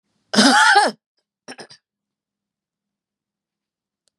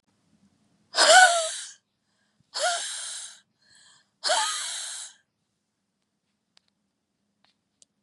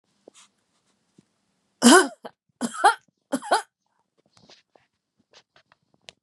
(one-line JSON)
{"cough_length": "4.2 s", "cough_amplitude": 31271, "cough_signal_mean_std_ratio": 0.31, "exhalation_length": "8.0 s", "exhalation_amplitude": 23750, "exhalation_signal_mean_std_ratio": 0.31, "three_cough_length": "6.2 s", "three_cough_amplitude": 29780, "three_cough_signal_mean_std_ratio": 0.23, "survey_phase": "beta (2021-08-13 to 2022-03-07)", "age": "45-64", "gender": "Female", "wearing_mask": "No", "symptom_cough_any": true, "smoker_status": "Never smoked", "respiratory_condition_asthma": false, "respiratory_condition_other": false, "recruitment_source": "Test and Trace", "submission_delay": "2 days", "covid_test_result": "Positive", "covid_test_method": "LFT"}